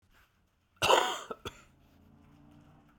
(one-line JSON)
{"cough_length": "3.0 s", "cough_amplitude": 10434, "cough_signal_mean_std_ratio": 0.3, "survey_phase": "beta (2021-08-13 to 2022-03-07)", "age": "45-64", "gender": "Male", "wearing_mask": "No", "symptom_cough_any": true, "symptom_new_continuous_cough": true, "symptom_runny_or_blocked_nose": true, "symptom_sore_throat": true, "symptom_fatigue": true, "symptom_fever_high_temperature": true, "symptom_headache": true, "symptom_change_to_sense_of_smell_or_taste": true, "symptom_loss_of_taste": true, "symptom_onset": "3 days", "smoker_status": "Never smoked", "respiratory_condition_asthma": false, "respiratory_condition_other": false, "recruitment_source": "Test and Trace", "submission_delay": "2 days", "covid_test_result": "Positive", "covid_test_method": "RT-qPCR", "covid_ct_value": 22.1, "covid_ct_gene": "ORF1ab gene", "covid_ct_mean": 22.8, "covid_viral_load": "33000 copies/ml", "covid_viral_load_category": "Low viral load (10K-1M copies/ml)"}